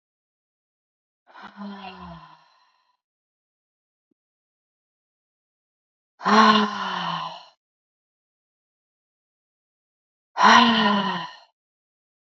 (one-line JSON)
{"exhalation_length": "12.2 s", "exhalation_amplitude": 27243, "exhalation_signal_mean_std_ratio": 0.29, "survey_phase": "beta (2021-08-13 to 2022-03-07)", "age": "45-64", "gender": "Female", "wearing_mask": "No", "symptom_none": true, "smoker_status": "Ex-smoker", "respiratory_condition_asthma": false, "respiratory_condition_other": false, "recruitment_source": "REACT", "submission_delay": "2 days", "covid_test_result": "Negative", "covid_test_method": "RT-qPCR", "influenza_a_test_result": "Negative", "influenza_b_test_result": "Negative"}